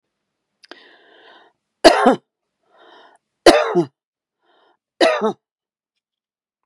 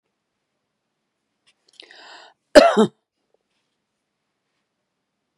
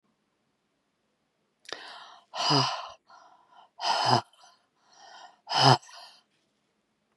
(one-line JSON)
{"three_cough_length": "6.7 s", "three_cough_amplitude": 32768, "three_cough_signal_mean_std_ratio": 0.27, "cough_length": "5.4 s", "cough_amplitude": 32768, "cough_signal_mean_std_ratio": 0.17, "exhalation_length": "7.2 s", "exhalation_amplitude": 17675, "exhalation_signal_mean_std_ratio": 0.31, "survey_phase": "beta (2021-08-13 to 2022-03-07)", "age": "45-64", "gender": "Female", "wearing_mask": "No", "symptom_none": true, "smoker_status": "Ex-smoker", "respiratory_condition_asthma": false, "respiratory_condition_other": false, "recruitment_source": "REACT", "submission_delay": "1 day", "covid_test_result": "Negative", "covid_test_method": "RT-qPCR", "influenza_a_test_result": "Negative", "influenza_b_test_result": "Negative"}